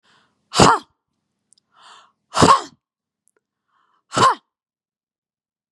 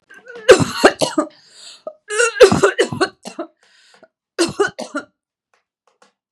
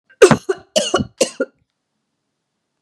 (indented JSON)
{
  "exhalation_length": "5.7 s",
  "exhalation_amplitude": 32768,
  "exhalation_signal_mean_std_ratio": 0.26,
  "three_cough_length": "6.3 s",
  "three_cough_amplitude": 32768,
  "three_cough_signal_mean_std_ratio": 0.36,
  "cough_length": "2.8 s",
  "cough_amplitude": 32768,
  "cough_signal_mean_std_ratio": 0.3,
  "survey_phase": "beta (2021-08-13 to 2022-03-07)",
  "age": "45-64",
  "gender": "Female",
  "wearing_mask": "No",
  "symptom_none": true,
  "smoker_status": "Never smoked",
  "respiratory_condition_asthma": false,
  "respiratory_condition_other": false,
  "recruitment_source": "REACT",
  "submission_delay": "2 days",
  "covid_test_result": "Negative",
  "covid_test_method": "RT-qPCR",
  "influenza_a_test_result": "Unknown/Void",
  "influenza_b_test_result": "Unknown/Void"
}